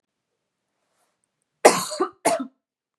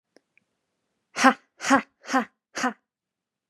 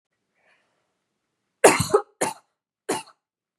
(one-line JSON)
{"cough_length": "3.0 s", "cough_amplitude": 32768, "cough_signal_mean_std_ratio": 0.26, "exhalation_length": "3.5 s", "exhalation_amplitude": 30466, "exhalation_signal_mean_std_ratio": 0.28, "three_cough_length": "3.6 s", "three_cough_amplitude": 32767, "three_cough_signal_mean_std_ratio": 0.24, "survey_phase": "beta (2021-08-13 to 2022-03-07)", "age": "18-44", "gender": "Female", "wearing_mask": "No", "symptom_none": true, "smoker_status": "Prefer not to say", "respiratory_condition_asthma": false, "respiratory_condition_other": false, "recruitment_source": "REACT", "submission_delay": "1 day", "covid_test_result": "Negative", "covid_test_method": "RT-qPCR", "influenza_a_test_result": "Negative", "influenza_b_test_result": "Negative"}